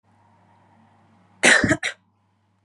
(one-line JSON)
{"cough_length": "2.6 s", "cough_amplitude": 27187, "cough_signal_mean_std_ratio": 0.29, "survey_phase": "beta (2021-08-13 to 2022-03-07)", "age": "18-44", "gender": "Female", "wearing_mask": "No", "symptom_none": true, "smoker_status": "Never smoked", "respiratory_condition_asthma": false, "respiratory_condition_other": false, "recruitment_source": "REACT", "submission_delay": "3 days", "covid_test_result": "Negative", "covid_test_method": "RT-qPCR", "influenza_a_test_result": "Unknown/Void", "influenza_b_test_result": "Unknown/Void"}